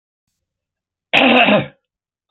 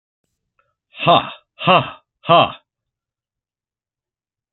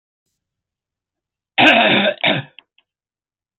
{"cough_length": "2.3 s", "cough_amplitude": 30647, "cough_signal_mean_std_ratio": 0.4, "exhalation_length": "4.5 s", "exhalation_amplitude": 30919, "exhalation_signal_mean_std_ratio": 0.29, "three_cough_length": "3.6 s", "three_cough_amplitude": 29513, "three_cough_signal_mean_std_ratio": 0.37, "survey_phase": "beta (2021-08-13 to 2022-03-07)", "age": "65+", "gender": "Male", "wearing_mask": "No", "symptom_cough_any": true, "symptom_runny_or_blocked_nose": true, "symptom_fatigue": true, "symptom_other": true, "symptom_onset": "4 days", "smoker_status": "Ex-smoker", "respiratory_condition_asthma": false, "respiratory_condition_other": false, "recruitment_source": "Test and Trace", "submission_delay": "1 day", "covid_test_result": "Positive", "covid_test_method": "RT-qPCR", "covid_ct_value": 21.8, "covid_ct_gene": "ORF1ab gene"}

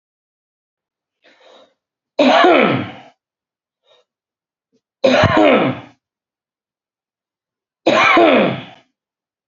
{"three_cough_length": "9.5 s", "three_cough_amplitude": 28856, "three_cough_signal_mean_std_ratio": 0.39, "survey_phase": "beta (2021-08-13 to 2022-03-07)", "age": "45-64", "gender": "Male", "wearing_mask": "No", "symptom_cough_any": true, "smoker_status": "Never smoked", "respiratory_condition_asthma": false, "respiratory_condition_other": false, "recruitment_source": "REACT", "submission_delay": "1 day", "covid_test_result": "Negative", "covid_test_method": "RT-qPCR", "influenza_a_test_result": "Negative", "influenza_b_test_result": "Negative"}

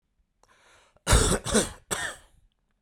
{"cough_length": "2.8 s", "cough_amplitude": 15481, "cough_signal_mean_std_ratio": 0.39, "survey_phase": "beta (2021-08-13 to 2022-03-07)", "age": "45-64", "gender": "Male", "wearing_mask": "No", "symptom_none": true, "smoker_status": "Current smoker (1 to 10 cigarettes per day)", "respiratory_condition_asthma": false, "respiratory_condition_other": false, "recruitment_source": "REACT", "submission_delay": "2 days", "covid_test_result": "Negative", "covid_test_method": "RT-qPCR", "influenza_a_test_result": "Negative", "influenza_b_test_result": "Negative"}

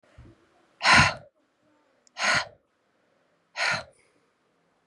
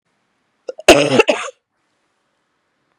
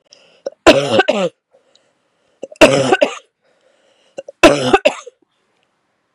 {"exhalation_length": "4.9 s", "exhalation_amplitude": 19033, "exhalation_signal_mean_std_ratio": 0.3, "cough_length": "3.0 s", "cough_amplitude": 32768, "cough_signal_mean_std_ratio": 0.29, "three_cough_length": "6.1 s", "three_cough_amplitude": 32768, "three_cough_signal_mean_std_ratio": 0.36, "survey_phase": "beta (2021-08-13 to 2022-03-07)", "age": "18-44", "gender": "Female", "wearing_mask": "No", "symptom_new_continuous_cough": true, "symptom_runny_or_blocked_nose": true, "symptom_sore_throat": true, "symptom_fatigue": true, "symptom_change_to_sense_of_smell_or_taste": true, "symptom_loss_of_taste": true, "symptom_other": true, "symptom_onset": "4 days", "smoker_status": "Never smoked", "respiratory_condition_asthma": true, "respiratory_condition_other": false, "recruitment_source": "Test and Trace", "submission_delay": "2 days", "covid_test_result": "Positive", "covid_test_method": "RT-qPCR", "covid_ct_value": 17.2, "covid_ct_gene": "ORF1ab gene"}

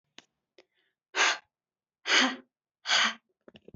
{"exhalation_length": "3.8 s", "exhalation_amplitude": 10639, "exhalation_signal_mean_std_ratio": 0.36, "survey_phase": "beta (2021-08-13 to 2022-03-07)", "age": "18-44", "gender": "Female", "wearing_mask": "No", "symptom_cough_any": true, "symptom_headache": true, "symptom_other": true, "symptom_onset": "4 days", "smoker_status": "Never smoked", "respiratory_condition_asthma": false, "respiratory_condition_other": false, "recruitment_source": "Test and Trace", "submission_delay": "2 days", "covid_test_result": "Positive", "covid_test_method": "RT-qPCR", "covid_ct_value": 33.4, "covid_ct_gene": "N gene"}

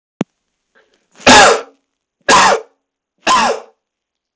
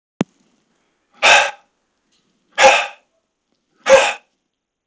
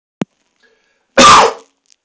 {"three_cough_length": "4.4 s", "three_cough_amplitude": 32768, "three_cough_signal_mean_std_ratio": 0.41, "exhalation_length": "4.9 s", "exhalation_amplitude": 31849, "exhalation_signal_mean_std_ratio": 0.32, "cough_length": "2.0 s", "cough_amplitude": 32768, "cough_signal_mean_std_ratio": 0.38, "survey_phase": "beta (2021-08-13 to 2022-03-07)", "age": "18-44", "gender": "Male", "wearing_mask": "No", "symptom_fatigue": true, "smoker_status": "Never smoked", "respiratory_condition_asthma": false, "respiratory_condition_other": false, "recruitment_source": "Test and Trace", "submission_delay": "1 day", "covid_test_result": "Negative", "covid_test_method": "LFT"}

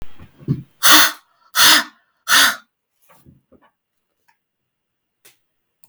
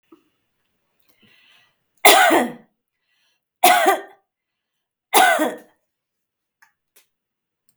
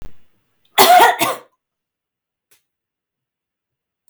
{"exhalation_length": "5.9 s", "exhalation_amplitude": 32768, "exhalation_signal_mean_std_ratio": 0.33, "three_cough_length": "7.8 s", "three_cough_amplitude": 32768, "three_cough_signal_mean_std_ratio": 0.31, "cough_length": "4.1 s", "cough_amplitude": 32768, "cough_signal_mean_std_ratio": 0.3, "survey_phase": "beta (2021-08-13 to 2022-03-07)", "age": "45-64", "gender": "Female", "wearing_mask": "No", "symptom_none": true, "smoker_status": "Never smoked", "respiratory_condition_asthma": false, "respiratory_condition_other": false, "recruitment_source": "REACT", "submission_delay": "4 days", "covid_test_result": "Negative", "covid_test_method": "RT-qPCR", "influenza_a_test_result": "Negative", "influenza_b_test_result": "Negative"}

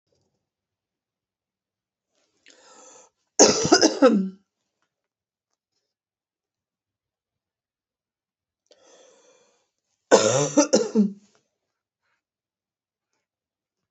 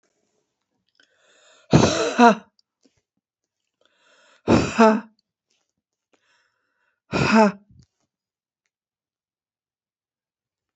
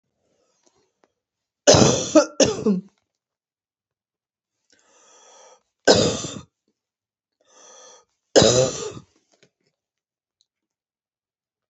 {"cough_length": "13.9 s", "cough_amplitude": 28400, "cough_signal_mean_std_ratio": 0.25, "exhalation_length": "10.8 s", "exhalation_amplitude": 28310, "exhalation_signal_mean_std_ratio": 0.26, "three_cough_length": "11.7 s", "three_cough_amplitude": 32307, "three_cough_signal_mean_std_ratio": 0.28, "survey_phase": "beta (2021-08-13 to 2022-03-07)", "age": "45-64", "gender": "Female", "wearing_mask": "No", "symptom_cough_any": true, "symptom_runny_or_blocked_nose": true, "smoker_status": "Ex-smoker", "respiratory_condition_asthma": false, "respiratory_condition_other": false, "recruitment_source": "Test and Trace", "submission_delay": "1 day", "covid_test_result": "Positive", "covid_test_method": "RT-qPCR", "covid_ct_value": 32.1, "covid_ct_gene": "ORF1ab gene", "covid_ct_mean": 32.6, "covid_viral_load": "21 copies/ml", "covid_viral_load_category": "Minimal viral load (< 10K copies/ml)"}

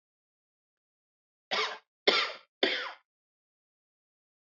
{"three_cough_length": "4.5 s", "three_cough_amplitude": 14284, "three_cough_signal_mean_std_ratio": 0.29, "survey_phase": "beta (2021-08-13 to 2022-03-07)", "age": "65+", "gender": "Male", "wearing_mask": "No", "symptom_cough_any": true, "symptom_runny_or_blocked_nose": true, "symptom_sore_throat": true, "symptom_onset": "4 days", "smoker_status": "Ex-smoker", "respiratory_condition_asthma": false, "respiratory_condition_other": false, "recruitment_source": "Test and Trace", "submission_delay": "1 day", "covid_test_result": "Positive", "covid_test_method": "RT-qPCR", "covid_ct_value": 18.6, "covid_ct_gene": "N gene"}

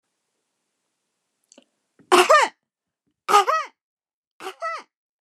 {"three_cough_length": "5.2 s", "three_cough_amplitude": 26764, "three_cough_signal_mean_std_ratio": 0.29, "survey_phase": "beta (2021-08-13 to 2022-03-07)", "age": "65+", "gender": "Female", "wearing_mask": "No", "symptom_none": true, "smoker_status": "Never smoked", "respiratory_condition_asthma": false, "respiratory_condition_other": false, "recruitment_source": "REACT", "submission_delay": "3 days", "covid_test_result": "Negative", "covid_test_method": "RT-qPCR"}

